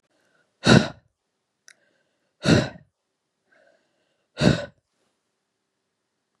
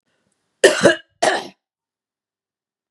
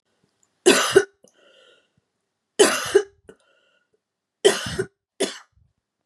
exhalation_length: 6.4 s
exhalation_amplitude: 29481
exhalation_signal_mean_std_ratio: 0.23
cough_length: 2.9 s
cough_amplitude: 32768
cough_signal_mean_std_ratio: 0.29
three_cough_length: 6.1 s
three_cough_amplitude: 30625
three_cough_signal_mean_std_ratio: 0.3
survey_phase: beta (2021-08-13 to 2022-03-07)
age: 45-64
gender: Female
wearing_mask: 'No'
symptom_sore_throat: true
symptom_fatigue: true
symptom_headache: true
smoker_status: Never smoked
respiratory_condition_asthma: false
respiratory_condition_other: false
recruitment_source: Test and Trace
submission_delay: 2 days
covid_test_result: Positive
covid_test_method: RT-qPCR
covid_ct_value: 11.5
covid_ct_gene: ORF1ab gene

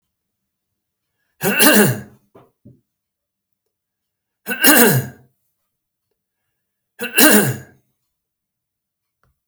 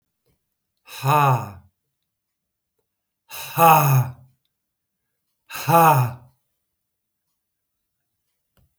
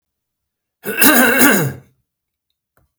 three_cough_length: 9.5 s
three_cough_amplitude: 32768
three_cough_signal_mean_std_ratio: 0.31
exhalation_length: 8.8 s
exhalation_amplitude: 28632
exhalation_signal_mean_std_ratio: 0.33
cough_length: 3.0 s
cough_amplitude: 32768
cough_signal_mean_std_ratio: 0.43
survey_phase: beta (2021-08-13 to 2022-03-07)
age: 65+
gender: Male
wearing_mask: 'No'
symptom_none: true
smoker_status: Never smoked
respiratory_condition_asthma: false
respiratory_condition_other: false
recruitment_source: REACT
submission_delay: 1 day
covid_test_result: Negative
covid_test_method: RT-qPCR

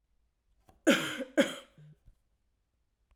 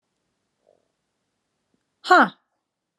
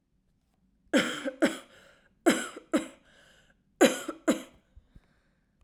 cough_length: 3.2 s
cough_amplitude: 8714
cough_signal_mean_std_ratio: 0.27
exhalation_length: 3.0 s
exhalation_amplitude: 25898
exhalation_signal_mean_std_ratio: 0.2
three_cough_length: 5.6 s
three_cough_amplitude: 13787
three_cough_signal_mean_std_ratio: 0.32
survey_phase: alpha (2021-03-01 to 2021-08-12)
age: 18-44
gender: Female
wearing_mask: 'No'
symptom_cough_any: true
symptom_shortness_of_breath: true
symptom_fatigue: true
symptom_onset: 6 days
smoker_status: Never smoked
respiratory_condition_asthma: false
respiratory_condition_other: false
recruitment_source: Test and Trace
submission_delay: 1 day
covid_test_result: Positive
covid_test_method: RT-qPCR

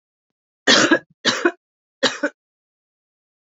three_cough_length: 3.4 s
three_cough_amplitude: 32768
three_cough_signal_mean_std_ratio: 0.34
survey_phase: beta (2021-08-13 to 2022-03-07)
age: 45-64
gender: Female
wearing_mask: 'No'
symptom_cough_any: true
symptom_runny_or_blocked_nose: true
symptom_headache: true
symptom_change_to_sense_of_smell_or_taste: true
symptom_other: true
symptom_onset: 4 days
smoker_status: Current smoker (1 to 10 cigarettes per day)
respiratory_condition_asthma: false
respiratory_condition_other: false
recruitment_source: Test and Trace
submission_delay: 2 days
covid_test_result: Positive
covid_test_method: RT-qPCR
covid_ct_value: 23.9
covid_ct_gene: N gene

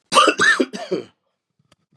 cough_length: 2.0 s
cough_amplitude: 29703
cough_signal_mean_std_ratio: 0.45
survey_phase: beta (2021-08-13 to 2022-03-07)
age: 45-64
gender: Male
wearing_mask: 'No'
symptom_cough_any: true
symptom_sore_throat: true
symptom_headache: true
symptom_loss_of_taste: true
symptom_onset: 6 days
smoker_status: Never smoked
respiratory_condition_asthma: false
respiratory_condition_other: false
recruitment_source: Test and Trace
submission_delay: 3 days
covid_test_result: Positive
covid_test_method: RT-qPCR
covid_ct_value: 25.9
covid_ct_gene: S gene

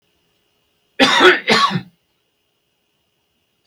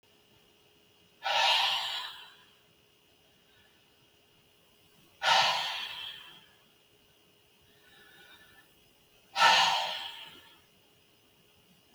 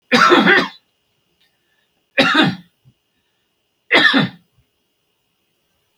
cough_length: 3.7 s
cough_amplitude: 32768
cough_signal_mean_std_ratio: 0.34
exhalation_length: 11.9 s
exhalation_amplitude: 10802
exhalation_signal_mean_std_ratio: 0.35
three_cough_length: 6.0 s
three_cough_amplitude: 32768
three_cough_signal_mean_std_ratio: 0.38
survey_phase: beta (2021-08-13 to 2022-03-07)
age: 65+
gender: Male
wearing_mask: 'No'
symptom_none: true
symptom_onset: 4 days
smoker_status: Ex-smoker
respiratory_condition_asthma: false
respiratory_condition_other: false
recruitment_source: REACT
submission_delay: 2 days
covid_test_result: Negative
covid_test_method: RT-qPCR
influenza_a_test_result: Negative
influenza_b_test_result: Negative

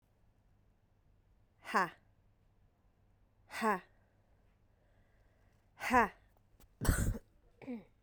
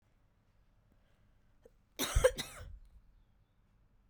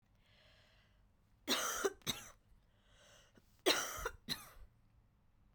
exhalation_length: 8.0 s
exhalation_amplitude: 5745
exhalation_signal_mean_std_ratio: 0.29
cough_length: 4.1 s
cough_amplitude: 6852
cough_signal_mean_std_ratio: 0.24
three_cough_length: 5.5 s
three_cough_amplitude: 3985
three_cough_signal_mean_std_ratio: 0.36
survey_phase: beta (2021-08-13 to 2022-03-07)
age: 18-44
gender: Female
wearing_mask: 'No'
symptom_cough_any: true
symptom_runny_or_blocked_nose: true
symptom_shortness_of_breath: true
symptom_fatigue: true
symptom_headache: true
symptom_onset: 3 days
smoker_status: Never smoked
respiratory_condition_asthma: false
respiratory_condition_other: false
recruitment_source: Test and Trace
submission_delay: 1 day
covid_test_result: Positive
covid_test_method: RT-qPCR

